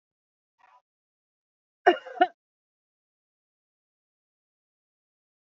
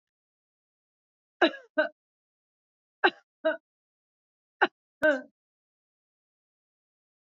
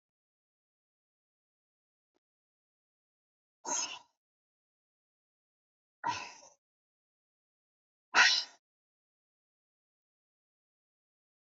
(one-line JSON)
{"cough_length": "5.5 s", "cough_amplitude": 16543, "cough_signal_mean_std_ratio": 0.13, "three_cough_length": "7.3 s", "three_cough_amplitude": 15735, "three_cough_signal_mean_std_ratio": 0.21, "exhalation_length": "11.5 s", "exhalation_amplitude": 8571, "exhalation_signal_mean_std_ratio": 0.17, "survey_phase": "beta (2021-08-13 to 2022-03-07)", "age": "65+", "gender": "Female", "wearing_mask": "No", "symptom_none": true, "smoker_status": "Never smoked", "respiratory_condition_asthma": false, "respiratory_condition_other": false, "recruitment_source": "REACT", "submission_delay": "2 days", "covid_test_result": "Negative", "covid_test_method": "RT-qPCR", "influenza_a_test_result": "Negative", "influenza_b_test_result": "Negative"}